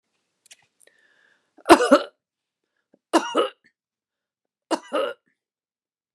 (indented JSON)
{
  "cough_length": "6.1 s",
  "cough_amplitude": 29204,
  "cough_signal_mean_std_ratio": 0.23,
  "survey_phase": "beta (2021-08-13 to 2022-03-07)",
  "age": "45-64",
  "gender": "Female",
  "wearing_mask": "No",
  "symptom_fatigue": true,
  "smoker_status": "Never smoked",
  "respiratory_condition_asthma": false,
  "respiratory_condition_other": false,
  "recruitment_source": "REACT",
  "submission_delay": "1 day",
  "covid_test_result": "Negative",
  "covid_test_method": "RT-qPCR"
}